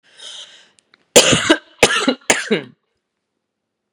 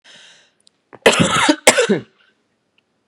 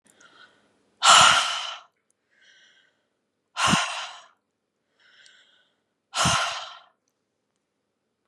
{"three_cough_length": "3.9 s", "three_cough_amplitude": 32768, "three_cough_signal_mean_std_ratio": 0.36, "cough_length": "3.1 s", "cough_amplitude": 32768, "cough_signal_mean_std_ratio": 0.39, "exhalation_length": "8.3 s", "exhalation_amplitude": 25781, "exhalation_signal_mean_std_ratio": 0.31, "survey_phase": "beta (2021-08-13 to 2022-03-07)", "age": "45-64", "gender": "Female", "wearing_mask": "No", "symptom_cough_any": true, "symptom_runny_or_blocked_nose": true, "symptom_onset": "12 days", "smoker_status": "Never smoked", "respiratory_condition_asthma": false, "respiratory_condition_other": false, "recruitment_source": "REACT", "submission_delay": "2 days", "covid_test_result": "Negative", "covid_test_method": "RT-qPCR", "influenza_a_test_result": "Negative", "influenza_b_test_result": "Negative"}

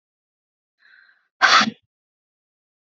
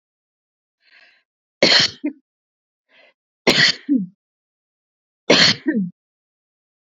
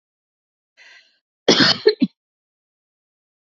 {"exhalation_length": "3.0 s", "exhalation_amplitude": 27179, "exhalation_signal_mean_std_ratio": 0.24, "three_cough_length": "7.0 s", "three_cough_amplitude": 31761, "three_cough_signal_mean_std_ratio": 0.33, "cough_length": "3.4 s", "cough_amplitude": 30587, "cough_signal_mean_std_ratio": 0.26, "survey_phase": "beta (2021-08-13 to 2022-03-07)", "age": "45-64", "gender": "Female", "wearing_mask": "No", "symptom_none": true, "smoker_status": "Ex-smoker", "respiratory_condition_asthma": false, "respiratory_condition_other": false, "recruitment_source": "REACT", "submission_delay": "2 days", "covid_test_result": "Negative", "covid_test_method": "RT-qPCR", "influenza_a_test_result": "Negative", "influenza_b_test_result": "Negative"}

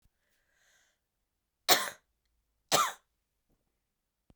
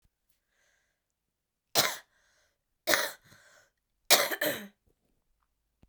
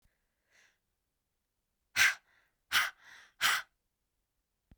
{"cough_length": "4.4 s", "cough_amplitude": 14316, "cough_signal_mean_std_ratio": 0.21, "three_cough_length": "5.9 s", "three_cough_amplitude": 21616, "three_cough_signal_mean_std_ratio": 0.26, "exhalation_length": "4.8 s", "exhalation_amplitude": 7957, "exhalation_signal_mean_std_ratio": 0.27, "survey_phase": "beta (2021-08-13 to 2022-03-07)", "age": "45-64", "gender": "Female", "wearing_mask": "No", "symptom_cough_any": true, "symptom_runny_or_blocked_nose": true, "symptom_shortness_of_breath": true, "symptom_sore_throat": true, "symptom_fatigue": true, "symptom_headache": true, "symptom_change_to_sense_of_smell_or_taste": true, "symptom_loss_of_taste": true, "symptom_onset": "3 days", "smoker_status": "Ex-smoker", "respiratory_condition_asthma": false, "respiratory_condition_other": false, "recruitment_source": "Test and Trace", "submission_delay": "2 days", "covid_test_result": "Positive", "covid_test_method": "ePCR"}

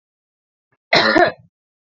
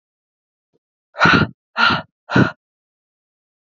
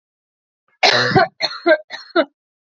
{"cough_length": "1.9 s", "cough_amplitude": 32358, "cough_signal_mean_std_ratio": 0.36, "exhalation_length": "3.8 s", "exhalation_amplitude": 29620, "exhalation_signal_mean_std_ratio": 0.33, "three_cough_length": "2.6 s", "three_cough_amplitude": 29042, "three_cough_signal_mean_std_ratio": 0.44, "survey_phase": "beta (2021-08-13 to 2022-03-07)", "age": "18-44", "gender": "Female", "wearing_mask": "No", "symptom_none": true, "smoker_status": "Never smoked", "respiratory_condition_asthma": false, "respiratory_condition_other": false, "recruitment_source": "REACT", "submission_delay": "1 day", "covid_test_result": "Negative", "covid_test_method": "RT-qPCR", "influenza_a_test_result": "Negative", "influenza_b_test_result": "Negative"}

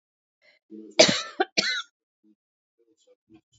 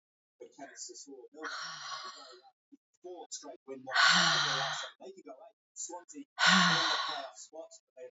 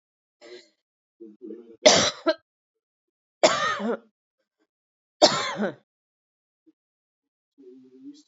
{"cough_length": "3.6 s", "cough_amplitude": 27674, "cough_signal_mean_std_ratio": 0.26, "exhalation_length": "8.1 s", "exhalation_amplitude": 9288, "exhalation_signal_mean_std_ratio": 0.46, "three_cough_length": "8.3 s", "three_cough_amplitude": 28321, "three_cough_signal_mean_std_ratio": 0.28, "survey_phase": "alpha (2021-03-01 to 2021-08-12)", "age": "45-64", "gender": "Female", "wearing_mask": "No", "symptom_fatigue": true, "symptom_headache": true, "symptom_onset": "9 days", "smoker_status": "Never smoked", "respiratory_condition_asthma": false, "respiratory_condition_other": false, "recruitment_source": "Test and Trace", "submission_delay": "3 days", "covid_test_result": "Positive", "covid_test_method": "RT-qPCR", "covid_ct_value": 22.9, "covid_ct_gene": "ORF1ab gene"}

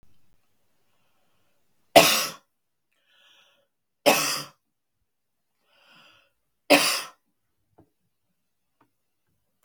{"three_cough_length": "9.6 s", "three_cough_amplitude": 32768, "three_cough_signal_mean_std_ratio": 0.22, "survey_phase": "beta (2021-08-13 to 2022-03-07)", "age": "65+", "gender": "Female", "wearing_mask": "No", "symptom_none": true, "symptom_onset": "12 days", "smoker_status": "Ex-smoker", "respiratory_condition_asthma": false, "respiratory_condition_other": false, "recruitment_source": "REACT", "submission_delay": "2 days", "covid_test_result": "Negative", "covid_test_method": "RT-qPCR", "influenza_a_test_result": "Negative", "influenza_b_test_result": "Negative"}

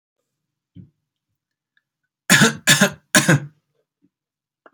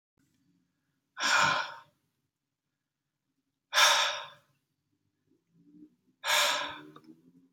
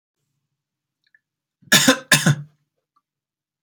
{"three_cough_length": "4.7 s", "three_cough_amplitude": 32768, "three_cough_signal_mean_std_ratio": 0.29, "exhalation_length": "7.5 s", "exhalation_amplitude": 10453, "exhalation_signal_mean_std_ratio": 0.35, "cough_length": "3.6 s", "cough_amplitude": 32768, "cough_signal_mean_std_ratio": 0.27, "survey_phase": "alpha (2021-03-01 to 2021-08-12)", "age": "18-44", "gender": "Male", "wearing_mask": "No", "symptom_none": true, "smoker_status": "Never smoked", "respiratory_condition_asthma": false, "respiratory_condition_other": false, "recruitment_source": "REACT", "submission_delay": "1 day", "covid_test_result": "Negative", "covid_test_method": "RT-qPCR"}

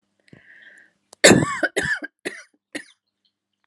{"cough_length": "3.7 s", "cough_amplitude": 32762, "cough_signal_mean_std_ratio": 0.29, "survey_phase": "alpha (2021-03-01 to 2021-08-12)", "age": "45-64", "gender": "Female", "wearing_mask": "No", "symptom_none": true, "smoker_status": "Never smoked", "respiratory_condition_asthma": false, "respiratory_condition_other": false, "recruitment_source": "REACT", "submission_delay": "1 day", "covid_test_result": "Negative", "covid_test_method": "RT-qPCR"}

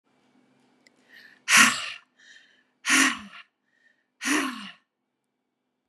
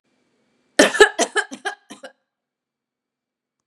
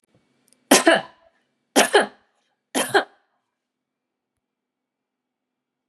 {"exhalation_length": "5.9 s", "exhalation_amplitude": 25055, "exhalation_signal_mean_std_ratio": 0.31, "cough_length": "3.7 s", "cough_amplitude": 32767, "cough_signal_mean_std_ratio": 0.25, "three_cough_length": "5.9 s", "three_cough_amplitude": 31970, "three_cough_signal_mean_std_ratio": 0.26, "survey_phase": "beta (2021-08-13 to 2022-03-07)", "age": "45-64", "gender": "Female", "wearing_mask": "No", "symptom_runny_or_blocked_nose": true, "smoker_status": "Never smoked", "respiratory_condition_asthma": false, "respiratory_condition_other": false, "recruitment_source": "REACT", "submission_delay": "2 days", "covid_test_result": "Negative", "covid_test_method": "RT-qPCR", "influenza_a_test_result": "Unknown/Void", "influenza_b_test_result": "Unknown/Void"}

